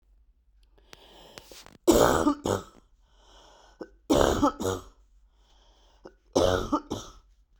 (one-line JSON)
{"three_cough_length": "7.6 s", "three_cough_amplitude": 18997, "three_cough_signal_mean_std_ratio": 0.38, "survey_phase": "beta (2021-08-13 to 2022-03-07)", "age": "18-44", "gender": "Female", "wearing_mask": "No", "symptom_cough_any": true, "symptom_runny_or_blocked_nose": true, "symptom_sore_throat": true, "symptom_fatigue": true, "symptom_change_to_sense_of_smell_or_taste": true, "symptom_loss_of_taste": true, "symptom_onset": "4 days", "smoker_status": "Never smoked", "respiratory_condition_asthma": false, "respiratory_condition_other": false, "recruitment_source": "Test and Trace", "submission_delay": "2 days", "covid_test_result": "Positive", "covid_test_method": "RT-qPCR", "covid_ct_value": 23.6, "covid_ct_gene": "ORF1ab gene"}